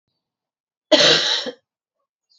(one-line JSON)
{"cough_length": "2.4 s", "cough_amplitude": 29460, "cough_signal_mean_std_ratio": 0.37, "survey_phase": "beta (2021-08-13 to 2022-03-07)", "age": "18-44", "gender": "Female", "wearing_mask": "No", "symptom_cough_any": true, "symptom_runny_or_blocked_nose": true, "symptom_sore_throat": true, "symptom_fatigue": true, "symptom_headache": true, "symptom_other": true, "symptom_onset": "4 days", "smoker_status": "Never smoked", "respiratory_condition_asthma": false, "respiratory_condition_other": false, "recruitment_source": "Test and Trace", "submission_delay": "2 days", "covid_test_result": "Positive", "covid_test_method": "RT-qPCR", "covid_ct_value": 35.0, "covid_ct_gene": "ORF1ab gene"}